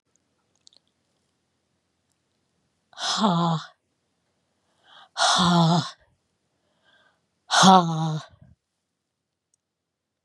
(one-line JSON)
{"exhalation_length": "10.2 s", "exhalation_amplitude": 29236, "exhalation_signal_mean_std_ratio": 0.34, "survey_phase": "beta (2021-08-13 to 2022-03-07)", "age": "65+", "gender": "Female", "wearing_mask": "No", "symptom_none": true, "smoker_status": "Never smoked", "respiratory_condition_asthma": false, "respiratory_condition_other": false, "recruitment_source": "REACT", "submission_delay": "2 days", "covid_test_result": "Negative", "covid_test_method": "RT-qPCR", "influenza_a_test_result": "Unknown/Void", "influenza_b_test_result": "Unknown/Void"}